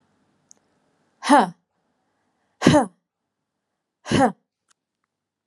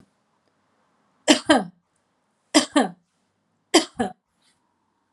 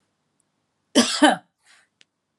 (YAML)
exhalation_length: 5.5 s
exhalation_amplitude: 32393
exhalation_signal_mean_std_ratio: 0.26
three_cough_length: 5.1 s
three_cough_amplitude: 30387
three_cough_signal_mean_std_ratio: 0.26
cough_length: 2.4 s
cough_amplitude: 31375
cough_signal_mean_std_ratio: 0.28
survey_phase: beta (2021-08-13 to 2022-03-07)
age: 45-64
gender: Female
wearing_mask: 'No'
symptom_none: true
smoker_status: Never smoked
respiratory_condition_asthma: false
respiratory_condition_other: false
recruitment_source: REACT
submission_delay: 1 day
covid_test_result: Negative
covid_test_method: RT-qPCR